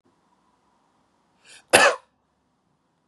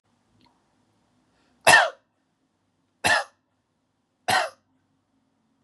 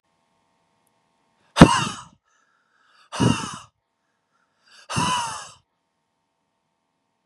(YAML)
cough_length: 3.1 s
cough_amplitude: 32768
cough_signal_mean_std_ratio: 0.21
three_cough_length: 5.6 s
three_cough_amplitude: 30993
three_cough_signal_mean_std_ratio: 0.24
exhalation_length: 7.3 s
exhalation_amplitude: 32768
exhalation_signal_mean_std_ratio: 0.23
survey_phase: beta (2021-08-13 to 2022-03-07)
age: 18-44
gender: Male
wearing_mask: 'No'
symptom_none: true
smoker_status: Ex-smoker
respiratory_condition_asthma: true
respiratory_condition_other: false
recruitment_source: Test and Trace
submission_delay: 2 days
covid_test_result: Positive
covid_test_method: RT-qPCR
covid_ct_value: 27.8
covid_ct_gene: ORF1ab gene
covid_ct_mean: 28.0
covid_viral_load: 670 copies/ml
covid_viral_load_category: Minimal viral load (< 10K copies/ml)